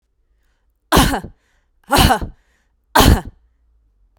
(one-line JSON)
{"three_cough_length": "4.2 s", "three_cough_amplitude": 32768, "three_cough_signal_mean_std_ratio": 0.36, "survey_phase": "beta (2021-08-13 to 2022-03-07)", "age": "18-44", "gender": "Female", "wearing_mask": "Yes", "symptom_sore_throat": true, "smoker_status": "Ex-smoker", "respiratory_condition_asthma": false, "respiratory_condition_other": false, "recruitment_source": "REACT", "submission_delay": "-15 days", "covid_test_result": "Negative", "covid_test_method": "RT-qPCR", "influenza_a_test_result": "Unknown/Void", "influenza_b_test_result": "Unknown/Void"}